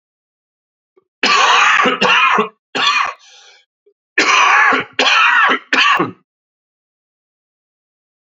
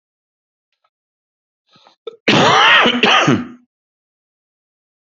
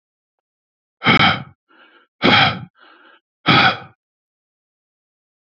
{"three_cough_length": "8.3 s", "three_cough_amplitude": 32767, "three_cough_signal_mean_std_ratio": 0.55, "cough_length": "5.1 s", "cough_amplitude": 29851, "cough_signal_mean_std_ratio": 0.4, "exhalation_length": "5.5 s", "exhalation_amplitude": 29757, "exhalation_signal_mean_std_ratio": 0.34, "survey_phase": "alpha (2021-03-01 to 2021-08-12)", "age": "45-64", "gender": "Male", "wearing_mask": "No", "symptom_cough_any": true, "symptom_change_to_sense_of_smell_or_taste": true, "symptom_loss_of_taste": true, "symptom_onset": "12 days", "smoker_status": "Never smoked", "respiratory_condition_asthma": false, "respiratory_condition_other": false, "recruitment_source": "REACT", "submission_delay": "2 days", "covid_test_result": "Negative", "covid_test_method": "RT-qPCR", "covid_ct_value": 39.0, "covid_ct_gene": "N gene"}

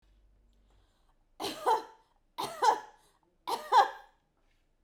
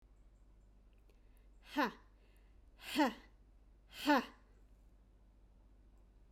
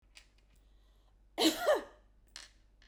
{"three_cough_length": "4.8 s", "three_cough_amplitude": 9076, "three_cough_signal_mean_std_ratio": 0.33, "exhalation_length": "6.3 s", "exhalation_amplitude": 3535, "exhalation_signal_mean_std_ratio": 0.3, "cough_length": "2.9 s", "cough_amplitude": 5453, "cough_signal_mean_std_ratio": 0.33, "survey_phase": "beta (2021-08-13 to 2022-03-07)", "age": "18-44", "gender": "Female", "wearing_mask": "No", "symptom_none": true, "smoker_status": "Never smoked", "respiratory_condition_asthma": false, "respiratory_condition_other": false, "recruitment_source": "REACT", "submission_delay": "1 day", "covid_test_result": "Negative", "covid_test_method": "RT-qPCR"}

